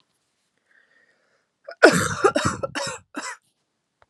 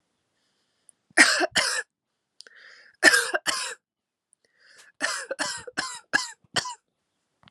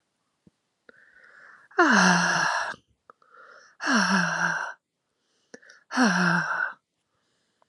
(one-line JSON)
{"cough_length": "4.1 s", "cough_amplitude": 32768, "cough_signal_mean_std_ratio": 0.31, "three_cough_length": "7.5 s", "three_cough_amplitude": 30132, "three_cough_signal_mean_std_ratio": 0.34, "exhalation_length": "7.7 s", "exhalation_amplitude": 15812, "exhalation_signal_mean_std_ratio": 0.48, "survey_phase": "beta (2021-08-13 to 2022-03-07)", "age": "18-44", "gender": "Female", "wearing_mask": "No", "symptom_cough_any": true, "symptom_runny_or_blocked_nose": true, "symptom_shortness_of_breath": true, "symptom_fatigue": true, "symptom_headache": true, "symptom_other": true, "symptom_onset": "3 days", "smoker_status": "Never smoked", "respiratory_condition_asthma": false, "respiratory_condition_other": false, "recruitment_source": "Test and Trace", "submission_delay": "2 days", "covid_test_result": "Positive", "covid_test_method": "RT-qPCR", "covid_ct_value": 21.4, "covid_ct_gene": "N gene"}